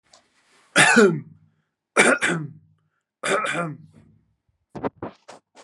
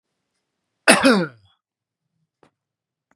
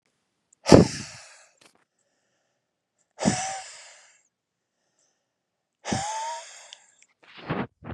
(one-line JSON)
{"three_cough_length": "5.6 s", "three_cough_amplitude": 31061, "three_cough_signal_mean_std_ratio": 0.38, "cough_length": "3.2 s", "cough_amplitude": 32767, "cough_signal_mean_std_ratio": 0.26, "exhalation_length": "7.9 s", "exhalation_amplitude": 32768, "exhalation_signal_mean_std_ratio": 0.23, "survey_phase": "beta (2021-08-13 to 2022-03-07)", "age": "45-64", "gender": "Male", "wearing_mask": "No", "symptom_none": true, "smoker_status": "Ex-smoker", "respiratory_condition_asthma": false, "respiratory_condition_other": false, "recruitment_source": "Test and Trace", "submission_delay": "2 days", "covid_test_result": "Negative", "covid_test_method": "RT-qPCR"}